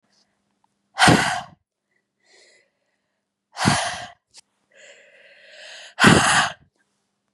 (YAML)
exhalation_length: 7.3 s
exhalation_amplitude: 32767
exhalation_signal_mean_std_ratio: 0.32
survey_phase: beta (2021-08-13 to 2022-03-07)
age: 18-44
gender: Female
wearing_mask: 'No'
symptom_cough_any: true
symptom_new_continuous_cough: true
symptom_runny_or_blocked_nose: true
symptom_onset: 5 days
smoker_status: Never smoked
respiratory_condition_asthma: false
respiratory_condition_other: false
recruitment_source: Test and Trace
submission_delay: 2 days
covid_test_result: Positive
covid_test_method: RT-qPCR
covid_ct_value: 30.5
covid_ct_gene: N gene